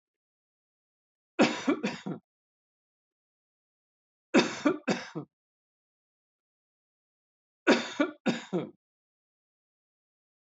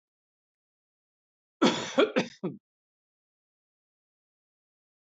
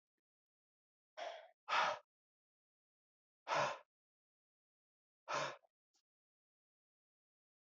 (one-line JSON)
{"three_cough_length": "10.6 s", "three_cough_amplitude": 11601, "three_cough_signal_mean_std_ratio": 0.27, "cough_length": "5.1 s", "cough_amplitude": 11268, "cough_signal_mean_std_ratio": 0.23, "exhalation_length": "7.7 s", "exhalation_amplitude": 2095, "exhalation_signal_mean_std_ratio": 0.27, "survey_phase": "beta (2021-08-13 to 2022-03-07)", "age": "45-64", "gender": "Male", "wearing_mask": "No", "symptom_none": true, "smoker_status": "Ex-smoker", "respiratory_condition_asthma": false, "respiratory_condition_other": false, "recruitment_source": "Test and Trace", "submission_delay": "0 days", "covid_test_result": "Negative", "covid_test_method": "LFT"}